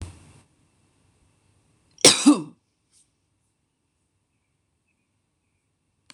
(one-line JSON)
{"cough_length": "6.1 s", "cough_amplitude": 26028, "cough_signal_mean_std_ratio": 0.17, "survey_phase": "beta (2021-08-13 to 2022-03-07)", "age": "45-64", "gender": "Female", "wearing_mask": "No", "symptom_cough_any": true, "symptom_runny_or_blocked_nose": true, "symptom_headache": true, "smoker_status": "Never smoked", "respiratory_condition_asthma": true, "respiratory_condition_other": false, "recruitment_source": "Test and Trace", "submission_delay": "1 day", "covid_test_result": "Positive", "covid_test_method": "RT-qPCR", "covid_ct_value": 29.5, "covid_ct_gene": "N gene"}